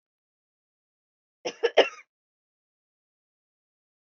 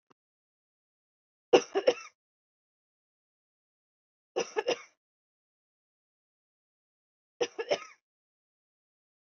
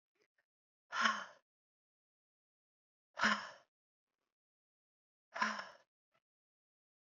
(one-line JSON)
{"cough_length": "4.0 s", "cough_amplitude": 18307, "cough_signal_mean_std_ratio": 0.15, "three_cough_length": "9.3 s", "three_cough_amplitude": 14574, "three_cough_signal_mean_std_ratio": 0.18, "exhalation_length": "7.1 s", "exhalation_amplitude": 3987, "exhalation_signal_mean_std_ratio": 0.25, "survey_phase": "beta (2021-08-13 to 2022-03-07)", "age": "45-64", "gender": "Female", "wearing_mask": "No", "symptom_none": true, "smoker_status": "Never smoked", "respiratory_condition_asthma": true, "respiratory_condition_other": false, "recruitment_source": "REACT", "submission_delay": "1 day", "covid_test_result": "Negative", "covid_test_method": "RT-qPCR"}